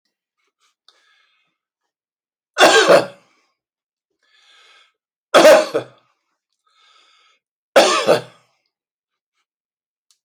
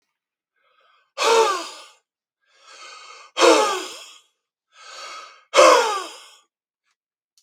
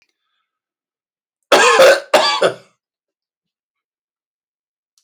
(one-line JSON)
{"three_cough_length": "10.2 s", "three_cough_amplitude": 29510, "three_cough_signal_mean_std_ratio": 0.28, "exhalation_length": "7.4 s", "exhalation_amplitude": 28148, "exhalation_signal_mean_std_ratio": 0.35, "cough_length": "5.0 s", "cough_amplitude": 28911, "cough_signal_mean_std_ratio": 0.33, "survey_phase": "beta (2021-08-13 to 2022-03-07)", "age": "45-64", "gender": "Male", "wearing_mask": "No", "symptom_none": true, "smoker_status": "Never smoked", "respiratory_condition_asthma": false, "respiratory_condition_other": false, "recruitment_source": "REACT", "submission_delay": "2 days", "covid_test_result": "Negative", "covid_test_method": "RT-qPCR"}